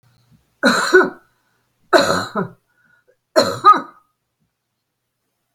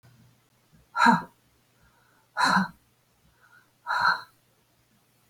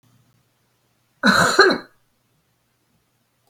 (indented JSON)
{
  "three_cough_length": "5.5 s",
  "three_cough_amplitude": 32768,
  "three_cough_signal_mean_std_ratio": 0.34,
  "exhalation_length": "5.3 s",
  "exhalation_amplitude": 16070,
  "exhalation_signal_mean_std_ratio": 0.32,
  "cough_length": "3.5 s",
  "cough_amplitude": 32768,
  "cough_signal_mean_std_ratio": 0.3,
  "survey_phase": "beta (2021-08-13 to 2022-03-07)",
  "age": "65+",
  "gender": "Female",
  "wearing_mask": "No",
  "symptom_none": true,
  "smoker_status": "Never smoked",
  "respiratory_condition_asthma": false,
  "respiratory_condition_other": false,
  "recruitment_source": "Test and Trace",
  "submission_delay": "1 day",
  "covid_test_result": "Negative",
  "covid_test_method": "RT-qPCR"
}